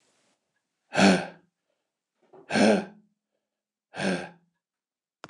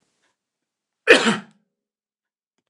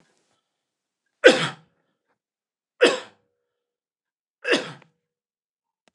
exhalation_length: 5.3 s
exhalation_amplitude: 20354
exhalation_signal_mean_std_ratio: 0.3
cough_length: 2.7 s
cough_amplitude: 29204
cough_signal_mean_std_ratio: 0.23
three_cough_length: 5.9 s
three_cough_amplitude: 29204
three_cough_signal_mean_std_ratio: 0.21
survey_phase: beta (2021-08-13 to 2022-03-07)
age: 45-64
gender: Male
wearing_mask: 'No'
symptom_none: true
smoker_status: Never smoked
respiratory_condition_asthma: false
respiratory_condition_other: false
recruitment_source: REACT
submission_delay: 1 day
covid_test_result: Negative
covid_test_method: RT-qPCR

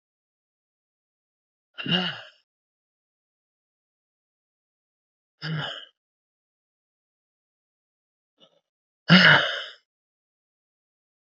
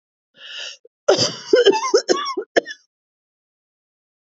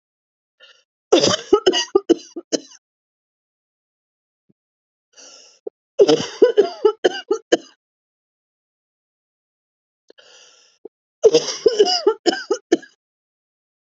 exhalation_length: 11.3 s
exhalation_amplitude: 28150
exhalation_signal_mean_std_ratio: 0.2
cough_length: 4.3 s
cough_amplitude: 27969
cough_signal_mean_std_ratio: 0.38
three_cough_length: 13.8 s
three_cough_amplitude: 29170
three_cough_signal_mean_std_ratio: 0.3
survey_phase: beta (2021-08-13 to 2022-03-07)
age: 45-64
gender: Female
wearing_mask: 'No'
symptom_cough_any: true
symptom_shortness_of_breath: true
symptom_sore_throat: true
symptom_fatigue: true
symptom_fever_high_temperature: true
symptom_headache: true
symptom_loss_of_taste: true
symptom_onset: 5 days
smoker_status: Ex-smoker
respiratory_condition_asthma: false
respiratory_condition_other: false
recruitment_source: Test and Trace
submission_delay: 2 days
covid_test_result: Positive
covid_test_method: RT-qPCR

